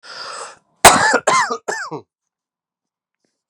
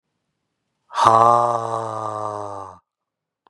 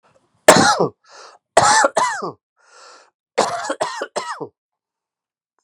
{
  "cough_length": "3.5 s",
  "cough_amplitude": 32768,
  "cough_signal_mean_std_ratio": 0.36,
  "exhalation_length": "3.5 s",
  "exhalation_amplitude": 32768,
  "exhalation_signal_mean_std_ratio": 0.42,
  "three_cough_length": "5.6 s",
  "three_cough_amplitude": 32768,
  "three_cough_signal_mean_std_ratio": 0.39,
  "survey_phase": "beta (2021-08-13 to 2022-03-07)",
  "age": "18-44",
  "gender": "Male",
  "wearing_mask": "No",
  "symptom_cough_any": true,
  "symptom_runny_or_blocked_nose": true,
  "symptom_fatigue": true,
  "symptom_headache": true,
  "symptom_change_to_sense_of_smell_or_taste": true,
  "symptom_loss_of_taste": true,
  "symptom_onset": "4 days",
  "smoker_status": "Current smoker (1 to 10 cigarettes per day)",
  "respiratory_condition_asthma": false,
  "respiratory_condition_other": false,
  "recruitment_source": "Test and Trace",
  "submission_delay": "2 days",
  "covid_test_result": "Positive",
  "covid_test_method": "RT-qPCR",
  "covid_ct_value": 23.4,
  "covid_ct_gene": "ORF1ab gene"
}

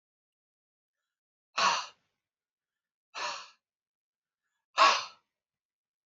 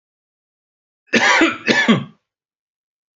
{
  "exhalation_length": "6.1 s",
  "exhalation_amplitude": 10175,
  "exhalation_signal_mean_std_ratio": 0.24,
  "cough_length": "3.2 s",
  "cough_amplitude": 32767,
  "cough_signal_mean_std_ratio": 0.4,
  "survey_phase": "beta (2021-08-13 to 2022-03-07)",
  "age": "45-64",
  "gender": "Male",
  "wearing_mask": "No",
  "symptom_none": true,
  "smoker_status": "Current smoker (e-cigarettes or vapes only)",
  "respiratory_condition_asthma": false,
  "respiratory_condition_other": false,
  "recruitment_source": "REACT",
  "submission_delay": "1 day",
  "covid_test_result": "Negative",
  "covid_test_method": "RT-qPCR",
  "influenza_a_test_result": "Negative",
  "influenza_b_test_result": "Negative"
}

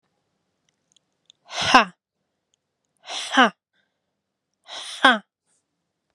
{
  "exhalation_length": "6.1 s",
  "exhalation_amplitude": 32767,
  "exhalation_signal_mean_std_ratio": 0.23,
  "survey_phase": "beta (2021-08-13 to 2022-03-07)",
  "age": "18-44",
  "gender": "Female",
  "wearing_mask": "No",
  "symptom_cough_any": true,
  "symptom_runny_or_blocked_nose": true,
  "symptom_abdominal_pain": true,
  "symptom_fatigue": true,
  "symptom_headache": true,
  "symptom_change_to_sense_of_smell_or_taste": true,
  "symptom_onset": "6 days",
  "smoker_status": "Never smoked",
  "respiratory_condition_asthma": true,
  "respiratory_condition_other": false,
  "recruitment_source": "REACT",
  "submission_delay": "2 days",
  "covid_test_result": "Positive",
  "covid_test_method": "RT-qPCR",
  "covid_ct_value": 23.0,
  "covid_ct_gene": "E gene"
}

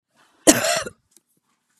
{
  "cough_length": "1.8 s",
  "cough_amplitude": 32767,
  "cough_signal_mean_std_ratio": 0.3,
  "survey_phase": "beta (2021-08-13 to 2022-03-07)",
  "age": "45-64",
  "gender": "Female",
  "wearing_mask": "No",
  "symptom_none": true,
  "smoker_status": "Current smoker (1 to 10 cigarettes per day)",
  "respiratory_condition_asthma": false,
  "respiratory_condition_other": false,
  "recruitment_source": "REACT",
  "submission_delay": "2 days",
  "covid_test_result": "Negative",
  "covid_test_method": "RT-qPCR",
  "influenza_a_test_result": "Negative",
  "influenza_b_test_result": "Negative"
}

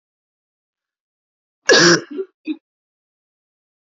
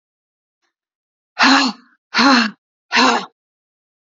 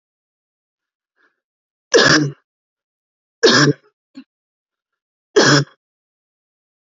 {
  "cough_length": "3.9 s",
  "cough_amplitude": 32768,
  "cough_signal_mean_std_ratio": 0.26,
  "exhalation_length": "4.1 s",
  "exhalation_amplitude": 29062,
  "exhalation_signal_mean_std_ratio": 0.4,
  "three_cough_length": "6.8 s",
  "three_cough_amplitude": 32768,
  "three_cough_signal_mean_std_ratio": 0.3,
  "survey_phase": "beta (2021-08-13 to 2022-03-07)",
  "age": "18-44",
  "gender": "Female",
  "wearing_mask": "No",
  "symptom_cough_any": true,
  "symptom_new_continuous_cough": true,
  "symptom_runny_or_blocked_nose": true,
  "symptom_shortness_of_breath": true,
  "symptom_sore_throat": true,
  "symptom_abdominal_pain": true,
  "symptom_diarrhoea": true,
  "symptom_fatigue": true,
  "symptom_headache": true,
  "symptom_change_to_sense_of_smell_or_taste": true,
  "symptom_loss_of_taste": true,
  "symptom_onset": "5 days",
  "smoker_status": "Ex-smoker",
  "respiratory_condition_asthma": false,
  "respiratory_condition_other": false,
  "recruitment_source": "Test and Trace",
  "submission_delay": "1 day",
  "covid_test_result": "Positive",
  "covid_test_method": "RT-qPCR",
  "covid_ct_value": 31.1,
  "covid_ct_gene": "ORF1ab gene"
}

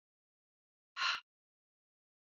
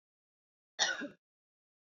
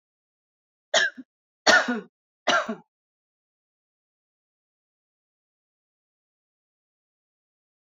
{
  "exhalation_length": "2.2 s",
  "exhalation_amplitude": 2460,
  "exhalation_signal_mean_std_ratio": 0.24,
  "cough_length": "2.0 s",
  "cough_amplitude": 6287,
  "cough_signal_mean_std_ratio": 0.27,
  "three_cough_length": "7.9 s",
  "three_cough_amplitude": 22507,
  "three_cough_signal_mean_std_ratio": 0.22,
  "survey_phase": "beta (2021-08-13 to 2022-03-07)",
  "age": "18-44",
  "gender": "Female",
  "wearing_mask": "No",
  "symptom_none": true,
  "smoker_status": "Current smoker (e-cigarettes or vapes only)",
  "respiratory_condition_asthma": false,
  "respiratory_condition_other": false,
  "recruitment_source": "Test and Trace",
  "submission_delay": "1 day",
  "covid_test_result": "Negative",
  "covid_test_method": "LFT"
}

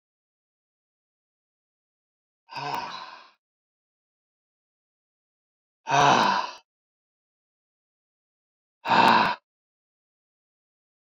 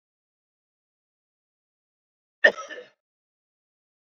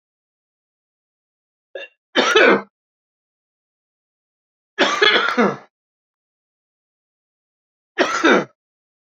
{
  "exhalation_length": "11.1 s",
  "exhalation_amplitude": 19568,
  "exhalation_signal_mean_std_ratio": 0.26,
  "cough_length": "4.1 s",
  "cough_amplitude": 24239,
  "cough_signal_mean_std_ratio": 0.12,
  "three_cough_length": "9.0 s",
  "three_cough_amplitude": 30195,
  "three_cough_signal_mean_std_ratio": 0.32,
  "survey_phase": "beta (2021-08-13 to 2022-03-07)",
  "age": "45-64",
  "gender": "Male",
  "wearing_mask": "No",
  "symptom_cough_any": true,
  "symptom_runny_or_blocked_nose": true,
  "symptom_change_to_sense_of_smell_or_taste": true,
  "symptom_onset": "4 days",
  "smoker_status": "Never smoked",
  "respiratory_condition_asthma": true,
  "respiratory_condition_other": true,
  "recruitment_source": "Test and Trace",
  "submission_delay": "1 day",
  "covid_test_result": "Positive",
  "covid_test_method": "RT-qPCR"
}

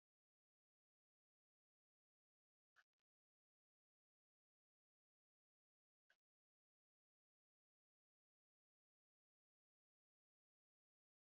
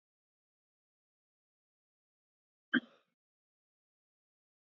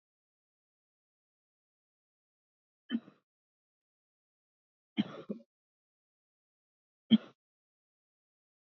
{
  "exhalation_length": "11.3 s",
  "exhalation_amplitude": 27,
  "exhalation_signal_mean_std_ratio": 0.06,
  "cough_length": "4.7 s",
  "cough_amplitude": 4425,
  "cough_signal_mean_std_ratio": 0.09,
  "three_cough_length": "8.8 s",
  "three_cough_amplitude": 7694,
  "three_cough_signal_mean_std_ratio": 0.12,
  "survey_phase": "beta (2021-08-13 to 2022-03-07)",
  "age": "45-64",
  "gender": "Female",
  "wearing_mask": "No",
  "symptom_none": true,
  "smoker_status": "Never smoked",
  "respiratory_condition_asthma": false,
  "respiratory_condition_other": false,
  "recruitment_source": "REACT",
  "submission_delay": "5 days",
  "covid_test_result": "Negative",
  "covid_test_method": "RT-qPCR",
  "influenza_a_test_result": "Negative",
  "influenza_b_test_result": "Negative"
}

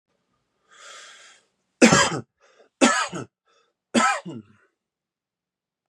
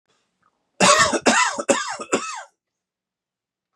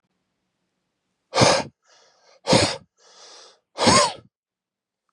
{
  "three_cough_length": "5.9 s",
  "three_cough_amplitude": 31300,
  "three_cough_signal_mean_std_ratio": 0.3,
  "cough_length": "3.8 s",
  "cough_amplitude": 29611,
  "cough_signal_mean_std_ratio": 0.42,
  "exhalation_length": "5.1 s",
  "exhalation_amplitude": 28211,
  "exhalation_signal_mean_std_ratio": 0.33,
  "survey_phase": "beta (2021-08-13 to 2022-03-07)",
  "age": "18-44",
  "gender": "Male",
  "wearing_mask": "No",
  "symptom_none": true,
  "smoker_status": "Current smoker (e-cigarettes or vapes only)",
  "respiratory_condition_asthma": false,
  "respiratory_condition_other": false,
  "recruitment_source": "REACT",
  "submission_delay": "1 day",
  "covid_test_result": "Negative",
  "covid_test_method": "RT-qPCR",
  "influenza_a_test_result": "Negative",
  "influenza_b_test_result": "Negative"
}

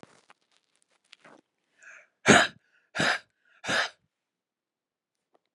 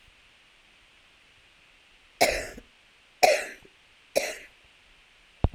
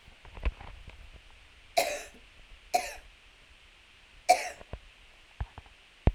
{
  "exhalation_length": "5.5 s",
  "exhalation_amplitude": 22201,
  "exhalation_signal_mean_std_ratio": 0.24,
  "cough_length": "5.5 s",
  "cough_amplitude": 21889,
  "cough_signal_mean_std_ratio": 0.27,
  "three_cough_length": "6.1 s",
  "three_cough_amplitude": 15648,
  "three_cough_signal_mean_std_ratio": 0.3,
  "survey_phase": "alpha (2021-03-01 to 2021-08-12)",
  "age": "45-64",
  "gender": "Female",
  "wearing_mask": "No",
  "symptom_none": true,
  "symptom_onset": "12 days",
  "smoker_status": "Current smoker (11 or more cigarettes per day)",
  "respiratory_condition_asthma": true,
  "respiratory_condition_other": false,
  "recruitment_source": "REACT",
  "submission_delay": "3 days",
  "covid_test_result": "Negative",
  "covid_test_method": "RT-qPCR"
}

